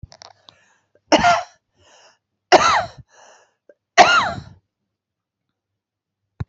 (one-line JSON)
{"three_cough_length": "6.5 s", "three_cough_amplitude": 29889, "three_cough_signal_mean_std_ratio": 0.3, "survey_phase": "beta (2021-08-13 to 2022-03-07)", "age": "45-64", "gender": "Female", "wearing_mask": "No", "symptom_cough_any": true, "symptom_runny_or_blocked_nose": true, "symptom_shortness_of_breath": true, "symptom_abdominal_pain": true, "symptom_fever_high_temperature": true, "symptom_change_to_sense_of_smell_or_taste": true, "symptom_onset": "3 days", "smoker_status": "Current smoker (1 to 10 cigarettes per day)", "respiratory_condition_asthma": false, "respiratory_condition_other": false, "recruitment_source": "Test and Trace", "submission_delay": "2 days", "covid_test_result": "Positive", "covid_test_method": "RT-qPCR", "covid_ct_value": 25.3, "covid_ct_gene": "ORF1ab gene"}